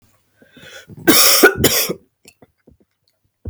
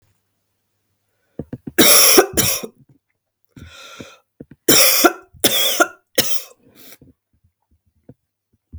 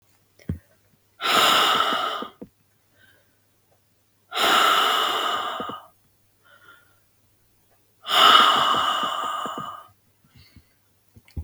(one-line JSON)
{"cough_length": "3.5 s", "cough_amplitude": 32768, "cough_signal_mean_std_ratio": 0.39, "three_cough_length": "8.8 s", "three_cough_amplitude": 32768, "three_cough_signal_mean_std_ratio": 0.36, "exhalation_length": "11.4 s", "exhalation_amplitude": 30375, "exhalation_signal_mean_std_ratio": 0.47, "survey_phase": "beta (2021-08-13 to 2022-03-07)", "age": "45-64", "gender": "Female", "wearing_mask": "No", "symptom_cough_any": true, "symptom_sore_throat": true, "symptom_fatigue": true, "symptom_fever_high_temperature": true, "symptom_headache": true, "symptom_other": true, "smoker_status": "Never smoked", "respiratory_condition_asthma": false, "respiratory_condition_other": false, "recruitment_source": "Test and Trace", "submission_delay": "0 days", "covid_test_result": "Positive", "covid_test_method": "LFT"}